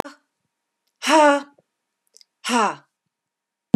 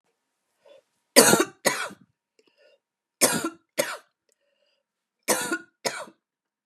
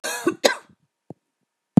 {"exhalation_length": "3.8 s", "exhalation_amplitude": 31057, "exhalation_signal_mean_std_ratio": 0.31, "three_cough_length": "6.7 s", "three_cough_amplitude": 32768, "three_cough_signal_mean_std_ratio": 0.29, "cough_length": "1.8 s", "cough_amplitude": 32682, "cough_signal_mean_std_ratio": 0.26, "survey_phase": "beta (2021-08-13 to 2022-03-07)", "age": "45-64", "gender": "Female", "wearing_mask": "No", "symptom_none": true, "smoker_status": "Never smoked", "respiratory_condition_asthma": false, "respiratory_condition_other": false, "recruitment_source": "REACT", "submission_delay": "1 day", "covid_test_result": "Negative", "covid_test_method": "RT-qPCR", "influenza_a_test_result": "Negative", "influenza_b_test_result": "Negative"}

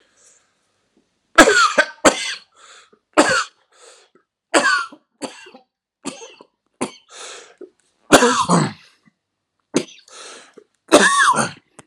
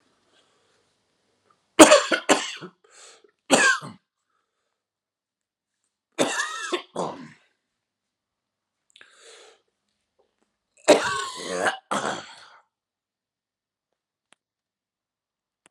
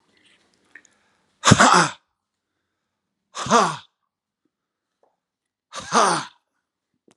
{"cough_length": "11.9 s", "cough_amplitude": 32768, "cough_signal_mean_std_ratio": 0.36, "three_cough_length": "15.7 s", "three_cough_amplitude": 32768, "three_cough_signal_mean_std_ratio": 0.24, "exhalation_length": "7.2 s", "exhalation_amplitude": 32768, "exhalation_signal_mean_std_ratio": 0.28, "survey_phase": "alpha (2021-03-01 to 2021-08-12)", "age": "65+", "gender": "Male", "wearing_mask": "No", "symptom_cough_any": true, "symptom_shortness_of_breath": true, "symptom_fatigue": true, "symptom_headache": true, "symptom_onset": "6 days", "smoker_status": "Never smoked", "respiratory_condition_asthma": true, "respiratory_condition_other": false, "recruitment_source": "Test and Trace", "submission_delay": "2 days", "covid_test_result": "Positive", "covid_test_method": "RT-qPCR", "covid_ct_value": 27.9, "covid_ct_gene": "ORF1ab gene", "covid_ct_mean": 28.5, "covid_viral_load": "450 copies/ml", "covid_viral_load_category": "Minimal viral load (< 10K copies/ml)"}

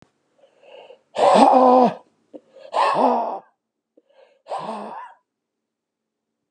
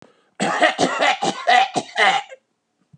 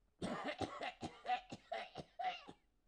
{"exhalation_length": "6.5 s", "exhalation_amplitude": 32764, "exhalation_signal_mean_std_ratio": 0.4, "cough_length": "3.0 s", "cough_amplitude": 31538, "cough_signal_mean_std_ratio": 0.58, "three_cough_length": "2.9 s", "three_cough_amplitude": 1625, "three_cough_signal_mean_std_ratio": 0.61, "survey_phase": "alpha (2021-03-01 to 2021-08-12)", "age": "45-64", "gender": "Male", "wearing_mask": "No", "symptom_none": true, "smoker_status": "Ex-smoker", "respiratory_condition_asthma": false, "respiratory_condition_other": false, "recruitment_source": "REACT", "submission_delay": "1 day", "covid_test_result": "Negative", "covid_test_method": "RT-qPCR"}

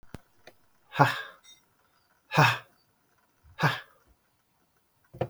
{"exhalation_length": "5.3 s", "exhalation_amplitude": 20810, "exhalation_signal_mean_std_ratio": 0.28, "survey_phase": "beta (2021-08-13 to 2022-03-07)", "age": "45-64", "gender": "Male", "wearing_mask": "No", "symptom_none": true, "smoker_status": "Never smoked", "respiratory_condition_asthma": false, "respiratory_condition_other": false, "recruitment_source": "REACT", "submission_delay": "2 days", "covid_test_result": "Negative", "covid_test_method": "RT-qPCR", "influenza_a_test_result": "Negative", "influenza_b_test_result": "Negative"}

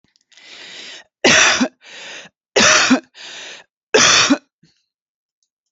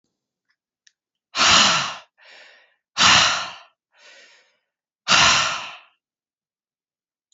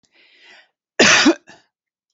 {"three_cough_length": "5.7 s", "three_cough_amplitude": 32768, "three_cough_signal_mean_std_ratio": 0.43, "exhalation_length": "7.3 s", "exhalation_amplitude": 29184, "exhalation_signal_mean_std_ratio": 0.37, "cough_length": "2.1 s", "cough_amplitude": 31695, "cough_signal_mean_std_ratio": 0.34, "survey_phase": "beta (2021-08-13 to 2022-03-07)", "age": "18-44", "gender": "Female", "wearing_mask": "No", "symptom_none": true, "smoker_status": "Ex-smoker", "respiratory_condition_asthma": false, "respiratory_condition_other": false, "recruitment_source": "REACT", "submission_delay": "1 day", "covid_test_result": "Negative", "covid_test_method": "RT-qPCR"}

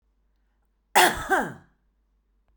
{"cough_length": "2.6 s", "cough_amplitude": 21432, "cough_signal_mean_std_ratio": 0.31, "survey_phase": "beta (2021-08-13 to 2022-03-07)", "age": "45-64", "gender": "Female", "wearing_mask": "No", "symptom_none": true, "smoker_status": "Current smoker (11 or more cigarettes per day)", "respiratory_condition_asthma": false, "respiratory_condition_other": false, "recruitment_source": "REACT", "submission_delay": "2 days", "covid_test_result": "Negative", "covid_test_method": "RT-qPCR"}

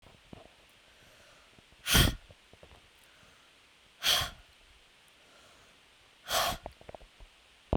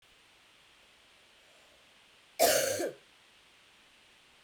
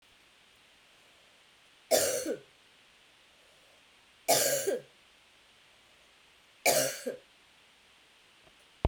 {"exhalation_length": "7.8 s", "exhalation_amplitude": 9895, "exhalation_signal_mean_std_ratio": 0.29, "cough_length": "4.4 s", "cough_amplitude": 8235, "cough_signal_mean_std_ratio": 0.3, "three_cough_length": "8.9 s", "three_cough_amplitude": 9854, "three_cough_signal_mean_std_ratio": 0.33, "survey_phase": "beta (2021-08-13 to 2022-03-07)", "age": "45-64", "gender": "Female", "wearing_mask": "No", "symptom_runny_or_blocked_nose": true, "symptom_sore_throat": true, "symptom_onset": "2 days", "smoker_status": "Never smoked", "respiratory_condition_asthma": false, "respiratory_condition_other": false, "recruitment_source": "Test and Trace", "submission_delay": "1 day", "covid_test_result": "Positive", "covid_test_method": "RT-qPCR", "covid_ct_value": 20.7, "covid_ct_gene": "ORF1ab gene"}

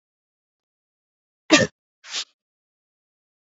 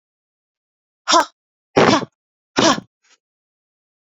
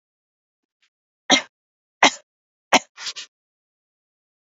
{"cough_length": "3.4 s", "cough_amplitude": 29957, "cough_signal_mean_std_ratio": 0.18, "exhalation_length": "4.0 s", "exhalation_amplitude": 28439, "exhalation_signal_mean_std_ratio": 0.31, "three_cough_length": "4.5 s", "three_cough_amplitude": 31699, "three_cough_signal_mean_std_ratio": 0.19, "survey_phase": "beta (2021-08-13 to 2022-03-07)", "age": "45-64", "gender": "Female", "wearing_mask": "No", "symptom_sore_throat": true, "symptom_onset": "2 days", "smoker_status": "Never smoked", "respiratory_condition_asthma": false, "respiratory_condition_other": false, "recruitment_source": "Test and Trace", "submission_delay": "2 days", "covid_test_result": "Positive", "covid_test_method": "RT-qPCR"}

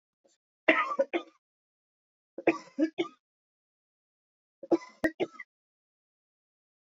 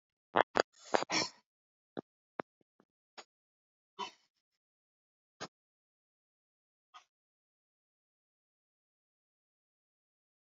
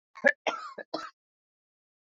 {"three_cough_length": "6.9 s", "three_cough_amplitude": 14432, "three_cough_signal_mean_std_ratio": 0.26, "exhalation_length": "10.5 s", "exhalation_amplitude": 12926, "exhalation_signal_mean_std_ratio": 0.12, "cough_length": "2.0 s", "cough_amplitude": 13461, "cough_signal_mean_std_ratio": 0.26, "survey_phase": "beta (2021-08-13 to 2022-03-07)", "age": "65+", "gender": "Female", "wearing_mask": "No", "symptom_none": true, "smoker_status": "Ex-smoker", "respiratory_condition_asthma": true, "respiratory_condition_other": false, "recruitment_source": "REACT", "submission_delay": "2 days", "covid_test_result": "Negative", "covid_test_method": "RT-qPCR", "influenza_a_test_result": "Negative", "influenza_b_test_result": "Negative"}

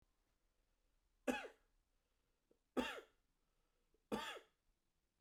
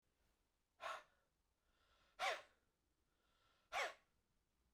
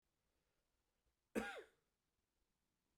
{"three_cough_length": "5.2 s", "three_cough_amplitude": 1741, "three_cough_signal_mean_std_ratio": 0.27, "exhalation_length": "4.7 s", "exhalation_amplitude": 923, "exhalation_signal_mean_std_ratio": 0.29, "cough_length": "3.0 s", "cough_amplitude": 1199, "cough_signal_mean_std_ratio": 0.22, "survey_phase": "beta (2021-08-13 to 2022-03-07)", "age": "45-64", "gender": "Male", "wearing_mask": "No", "symptom_runny_or_blocked_nose": true, "symptom_shortness_of_breath": true, "symptom_sore_throat": true, "symptom_fatigue": true, "symptom_headache": true, "symptom_onset": "4 days", "smoker_status": "Ex-smoker", "respiratory_condition_asthma": false, "respiratory_condition_other": false, "recruitment_source": "Test and Trace", "submission_delay": "2 days", "covid_test_result": "Positive", "covid_test_method": "ePCR"}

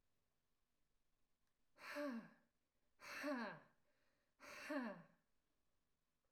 {"exhalation_length": "6.3 s", "exhalation_amplitude": 592, "exhalation_signal_mean_std_ratio": 0.42, "survey_phase": "alpha (2021-03-01 to 2021-08-12)", "age": "18-44", "gender": "Female", "wearing_mask": "No", "symptom_none": true, "smoker_status": "Never smoked", "respiratory_condition_asthma": false, "respiratory_condition_other": false, "recruitment_source": "REACT", "submission_delay": "1 day", "covid_test_result": "Negative", "covid_test_method": "RT-qPCR"}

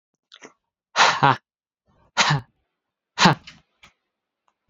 {"exhalation_length": "4.7 s", "exhalation_amplitude": 31409, "exhalation_signal_mean_std_ratio": 0.3, "survey_phase": "beta (2021-08-13 to 2022-03-07)", "age": "18-44", "gender": "Male", "wearing_mask": "No", "symptom_runny_or_blocked_nose": true, "symptom_shortness_of_breath": true, "symptom_fatigue": true, "symptom_headache": true, "smoker_status": "Ex-smoker", "respiratory_condition_asthma": false, "respiratory_condition_other": false, "recruitment_source": "Test and Trace", "submission_delay": "2 days", "covid_test_result": "Positive", "covid_test_method": "RT-qPCR", "covid_ct_value": 19.3, "covid_ct_gene": "ORF1ab gene", "covid_ct_mean": 20.5, "covid_viral_load": "190000 copies/ml", "covid_viral_load_category": "Low viral load (10K-1M copies/ml)"}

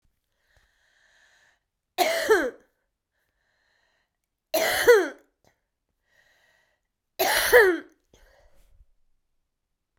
{"three_cough_length": "10.0 s", "three_cough_amplitude": 22932, "three_cough_signal_mean_std_ratio": 0.3, "survey_phase": "beta (2021-08-13 to 2022-03-07)", "age": "65+", "gender": "Female", "wearing_mask": "No", "symptom_cough_any": true, "symptom_runny_or_blocked_nose": true, "symptom_sore_throat": true, "symptom_fatigue": true, "symptom_change_to_sense_of_smell_or_taste": true, "symptom_loss_of_taste": true, "symptom_onset": "6 days", "smoker_status": "Never smoked", "respiratory_condition_asthma": false, "respiratory_condition_other": true, "recruitment_source": "Test and Trace", "submission_delay": "2 days", "covid_test_result": "Positive", "covid_test_method": "RT-qPCR", "covid_ct_value": 14.8, "covid_ct_gene": "S gene", "covid_ct_mean": 15.2, "covid_viral_load": "10000000 copies/ml", "covid_viral_load_category": "High viral load (>1M copies/ml)"}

